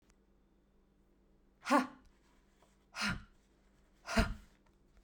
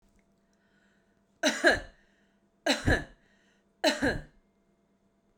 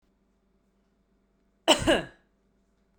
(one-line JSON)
{"exhalation_length": "5.0 s", "exhalation_amplitude": 5778, "exhalation_signal_mean_std_ratio": 0.29, "three_cough_length": "5.4 s", "three_cough_amplitude": 11330, "three_cough_signal_mean_std_ratio": 0.33, "cough_length": "3.0 s", "cough_amplitude": 17815, "cough_signal_mean_std_ratio": 0.24, "survey_phase": "beta (2021-08-13 to 2022-03-07)", "age": "45-64", "gender": "Female", "wearing_mask": "No", "symptom_none": true, "smoker_status": "Never smoked", "respiratory_condition_asthma": false, "respiratory_condition_other": false, "recruitment_source": "Test and Trace", "submission_delay": "2 days", "covid_test_result": "Negative", "covid_test_method": "ePCR"}